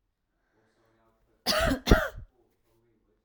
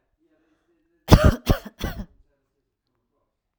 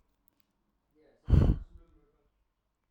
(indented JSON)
{
  "cough_length": "3.2 s",
  "cough_amplitude": 23802,
  "cough_signal_mean_std_ratio": 0.29,
  "three_cough_length": "3.6 s",
  "three_cough_amplitude": 32768,
  "three_cough_signal_mean_std_ratio": 0.24,
  "exhalation_length": "2.9 s",
  "exhalation_amplitude": 9348,
  "exhalation_signal_mean_std_ratio": 0.25,
  "survey_phase": "alpha (2021-03-01 to 2021-08-12)",
  "age": "18-44",
  "gender": "Female",
  "wearing_mask": "No",
  "symptom_none": true,
  "smoker_status": "Never smoked",
  "respiratory_condition_asthma": false,
  "respiratory_condition_other": false,
  "recruitment_source": "REACT",
  "submission_delay": "1 day",
  "covid_test_result": "Negative",
  "covid_test_method": "RT-qPCR"
}